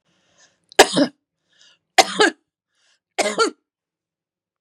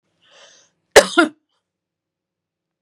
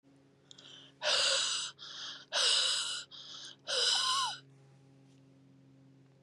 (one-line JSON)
{"three_cough_length": "4.6 s", "three_cough_amplitude": 32768, "three_cough_signal_mean_std_ratio": 0.28, "cough_length": "2.8 s", "cough_amplitude": 32768, "cough_signal_mean_std_ratio": 0.2, "exhalation_length": "6.2 s", "exhalation_amplitude": 5161, "exhalation_signal_mean_std_ratio": 0.55, "survey_phase": "beta (2021-08-13 to 2022-03-07)", "age": "45-64", "gender": "Female", "wearing_mask": "No", "symptom_none": true, "smoker_status": "Never smoked", "respiratory_condition_asthma": false, "respiratory_condition_other": false, "recruitment_source": "REACT", "submission_delay": "2 days", "covid_test_result": "Negative", "covid_test_method": "RT-qPCR", "influenza_a_test_result": "Negative", "influenza_b_test_result": "Negative"}